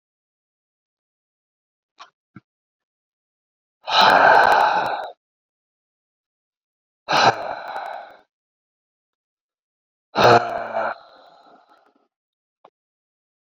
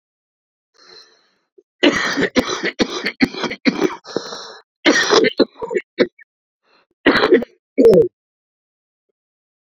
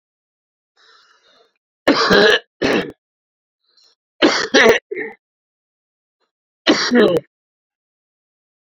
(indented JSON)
{
  "exhalation_length": "13.5 s",
  "exhalation_amplitude": 31573,
  "exhalation_signal_mean_std_ratio": 0.31,
  "cough_length": "9.7 s",
  "cough_amplitude": 32768,
  "cough_signal_mean_std_ratio": 0.41,
  "three_cough_length": "8.6 s",
  "three_cough_amplitude": 32212,
  "three_cough_signal_mean_std_ratio": 0.37,
  "survey_phase": "beta (2021-08-13 to 2022-03-07)",
  "age": "65+",
  "gender": "Male",
  "wearing_mask": "No",
  "symptom_cough_any": true,
  "symptom_new_continuous_cough": true,
  "symptom_runny_or_blocked_nose": true,
  "symptom_sore_throat": true,
  "symptom_abdominal_pain": true,
  "symptom_fatigue": true,
  "symptom_fever_high_temperature": true,
  "symptom_headache": true,
  "symptom_change_to_sense_of_smell_or_taste": true,
  "symptom_loss_of_taste": true,
  "symptom_onset": "5 days",
  "smoker_status": "Ex-smoker",
  "respiratory_condition_asthma": true,
  "respiratory_condition_other": false,
  "recruitment_source": "Test and Trace",
  "submission_delay": "1 day",
  "covid_test_result": "Positive",
  "covid_test_method": "RT-qPCR",
  "covid_ct_value": 15.6,
  "covid_ct_gene": "N gene",
  "covid_ct_mean": 15.9,
  "covid_viral_load": "6000000 copies/ml",
  "covid_viral_load_category": "High viral load (>1M copies/ml)"
}